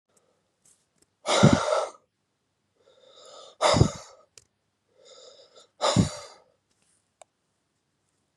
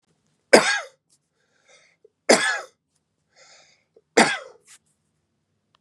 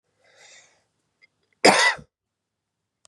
{"exhalation_length": "8.4 s", "exhalation_amplitude": 21082, "exhalation_signal_mean_std_ratio": 0.28, "three_cough_length": "5.8 s", "three_cough_amplitude": 32768, "three_cough_signal_mean_std_ratio": 0.25, "cough_length": "3.1 s", "cough_amplitude": 30155, "cough_signal_mean_std_ratio": 0.24, "survey_phase": "beta (2021-08-13 to 2022-03-07)", "age": "45-64", "gender": "Male", "wearing_mask": "No", "symptom_runny_or_blocked_nose": true, "symptom_shortness_of_breath": true, "symptom_diarrhoea": true, "symptom_fever_high_temperature": true, "symptom_headache": true, "symptom_change_to_sense_of_smell_or_taste": true, "smoker_status": "Current smoker (1 to 10 cigarettes per day)", "respiratory_condition_asthma": false, "respiratory_condition_other": false, "recruitment_source": "Test and Trace", "submission_delay": "-1 day", "covid_test_result": "Positive", "covid_test_method": "LFT"}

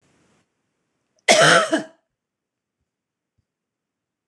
{"cough_length": "4.3 s", "cough_amplitude": 26028, "cough_signal_mean_std_ratio": 0.27, "survey_phase": "beta (2021-08-13 to 2022-03-07)", "age": "45-64", "gender": "Female", "wearing_mask": "No", "symptom_headache": true, "symptom_other": true, "smoker_status": "Never smoked", "respiratory_condition_asthma": false, "respiratory_condition_other": false, "recruitment_source": "REACT", "submission_delay": "1 day", "covid_test_result": "Negative", "covid_test_method": "RT-qPCR", "influenza_a_test_result": "Negative", "influenza_b_test_result": "Negative"}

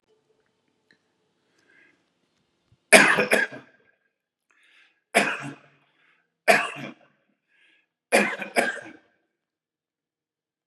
{"three_cough_length": "10.7 s", "three_cough_amplitude": 32767, "three_cough_signal_mean_std_ratio": 0.26, "survey_phase": "beta (2021-08-13 to 2022-03-07)", "age": "45-64", "gender": "Male", "wearing_mask": "No", "symptom_none": true, "smoker_status": "Never smoked", "respiratory_condition_asthma": false, "respiratory_condition_other": false, "recruitment_source": "REACT", "submission_delay": "32 days", "covid_test_result": "Negative", "covid_test_method": "RT-qPCR", "influenza_a_test_result": "Unknown/Void", "influenza_b_test_result": "Unknown/Void"}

